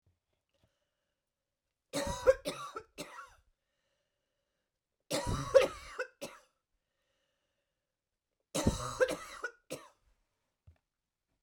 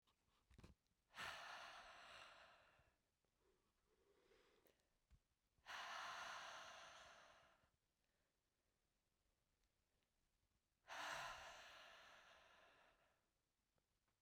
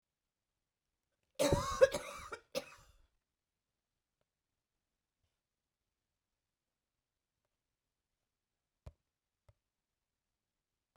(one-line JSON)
{"three_cough_length": "11.4 s", "three_cough_amplitude": 10383, "three_cough_signal_mean_std_ratio": 0.27, "exhalation_length": "14.2 s", "exhalation_amplitude": 392, "exhalation_signal_mean_std_ratio": 0.48, "cough_length": "11.0 s", "cough_amplitude": 7235, "cough_signal_mean_std_ratio": 0.17, "survey_phase": "beta (2021-08-13 to 2022-03-07)", "age": "45-64", "gender": "Female", "wearing_mask": "No", "symptom_cough_any": true, "symptom_fatigue": true, "symptom_onset": "12 days", "smoker_status": "Never smoked", "respiratory_condition_asthma": false, "respiratory_condition_other": false, "recruitment_source": "REACT", "submission_delay": "2 days", "covid_test_result": "Negative", "covid_test_method": "RT-qPCR", "influenza_a_test_result": "Negative", "influenza_b_test_result": "Negative"}